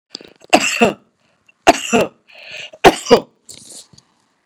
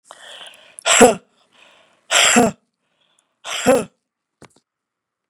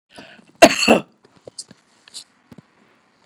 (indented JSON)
{
  "three_cough_length": "4.5 s",
  "three_cough_amplitude": 32768,
  "three_cough_signal_mean_std_ratio": 0.33,
  "exhalation_length": "5.3 s",
  "exhalation_amplitude": 32768,
  "exhalation_signal_mean_std_ratio": 0.33,
  "cough_length": "3.3 s",
  "cough_amplitude": 32768,
  "cough_signal_mean_std_ratio": 0.23,
  "survey_phase": "beta (2021-08-13 to 2022-03-07)",
  "age": "65+",
  "gender": "Female",
  "wearing_mask": "No",
  "symptom_none": true,
  "smoker_status": "Never smoked",
  "respiratory_condition_asthma": true,
  "respiratory_condition_other": false,
  "recruitment_source": "REACT",
  "submission_delay": "5 days",
  "covid_test_result": "Negative",
  "covid_test_method": "RT-qPCR"
}